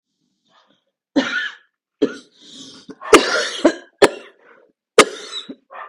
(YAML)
three_cough_length: 5.9 s
three_cough_amplitude: 32768
three_cough_signal_mean_std_ratio: 0.31
survey_phase: beta (2021-08-13 to 2022-03-07)
age: 45-64
gender: Female
wearing_mask: 'No'
symptom_cough_any: true
symptom_runny_or_blocked_nose: true
symptom_sore_throat: true
symptom_fatigue: true
smoker_status: Ex-smoker
respiratory_condition_asthma: false
respiratory_condition_other: false
recruitment_source: Test and Trace
submission_delay: 7 days
covid_test_result: Negative
covid_test_method: RT-qPCR